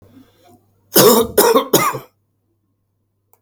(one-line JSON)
{"three_cough_length": "3.4 s", "three_cough_amplitude": 32768, "three_cough_signal_mean_std_ratio": 0.4, "survey_phase": "alpha (2021-03-01 to 2021-08-12)", "age": "45-64", "gender": "Male", "wearing_mask": "No", "symptom_none": true, "symptom_fatigue": true, "smoker_status": "Never smoked", "respiratory_condition_asthma": true, "respiratory_condition_other": false, "recruitment_source": "REACT", "submission_delay": "2 days", "covid_test_result": "Negative", "covid_test_method": "RT-qPCR"}